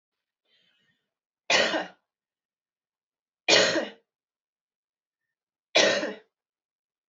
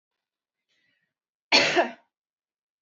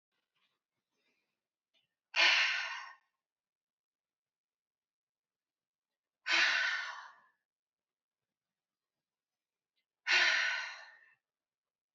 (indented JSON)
{
  "three_cough_length": "7.1 s",
  "three_cough_amplitude": 17721,
  "three_cough_signal_mean_std_ratio": 0.29,
  "cough_length": "2.8 s",
  "cough_amplitude": 17711,
  "cough_signal_mean_std_ratio": 0.27,
  "exhalation_length": "11.9 s",
  "exhalation_amplitude": 5344,
  "exhalation_signal_mean_std_ratio": 0.31,
  "survey_phase": "beta (2021-08-13 to 2022-03-07)",
  "age": "65+",
  "gender": "Female",
  "wearing_mask": "No",
  "symptom_none": true,
  "smoker_status": "Ex-smoker",
  "respiratory_condition_asthma": false,
  "respiratory_condition_other": false,
  "recruitment_source": "REACT",
  "submission_delay": "1 day",
  "covid_test_result": "Negative",
  "covid_test_method": "RT-qPCR",
  "influenza_a_test_result": "Negative",
  "influenza_b_test_result": "Negative"
}